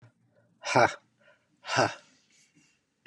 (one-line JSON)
{"exhalation_length": "3.1 s", "exhalation_amplitude": 12467, "exhalation_signal_mean_std_ratio": 0.29, "survey_phase": "beta (2021-08-13 to 2022-03-07)", "age": "65+", "gender": "Male", "wearing_mask": "No", "symptom_none": true, "smoker_status": "Never smoked", "respiratory_condition_asthma": false, "respiratory_condition_other": false, "recruitment_source": "REACT", "submission_delay": "1 day", "covid_test_result": "Negative", "covid_test_method": "RT-qPCR", "influenza_a_test_result": "Negative", "influenza_b_test_result": "Negative"}